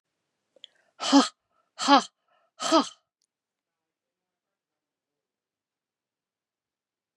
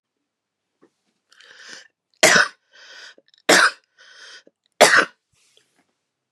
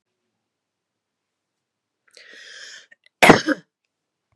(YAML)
exhalation_length: 7.2 s
exhalation_amplitude: 21697
exhalation_signal_mean_std_ratio: 0.21
three_cough_length: 6.3 s
three_cough_amplitude: 32768
three_cough_signal_mean_std_ratio: 0.27
cough_length: 4.4 s
cough_amplitude: 32768
cough_signal_mean_std_ratio: 0.18
survey_phase: beta (2021-08-13 to 2022-03-07)
age: 45-64
gender: Female
wearing_mask: 'No'
symptom_cough_any: true
symptom_loss_of_taste: true
symptom_onset: 2 days
smoker_status: Never smoked
respiratory_condition_asthma: false
respiratory_condition_other: false
recruitment_source: Test and Trace
submission_delay: 1 day
covid_test_result: Negative
covid_test_method: RT-qPCR